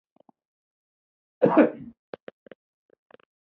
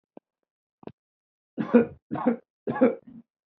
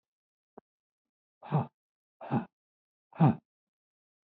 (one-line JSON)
{"cough_length": "3.6 s", "cough_amplitude": 18091, "cough_signal_mean_std_ratio": 0.22, "three_cough_length": "3.6 s", "three_cough_amplitude": 17115, "three_cough_signal_mean_std_ratio": 0.31, "exhalation_length": "4.3 s", "exhalation_amplitude": 7720, "exhalation_signal_mean_std_ratio": 0.24, "survey_phase": "beta (2021-08-13 to 2022-03-07)", "age": "65+", "gender": "Male", "wearing_mask": "No", "symptom_none": true, "smoker_status": "Never smoked", "respiratory_condition_asthma": false, "respiratory_condition_other": false, "recruitment_source": "REACT", "submission_delay": "1 day", "covid_test_result": "Negative", "covid_test_method": "RT-qPCR", "influenza_a_test_result": "Negative", "influenza_b_test_result": "Negative"}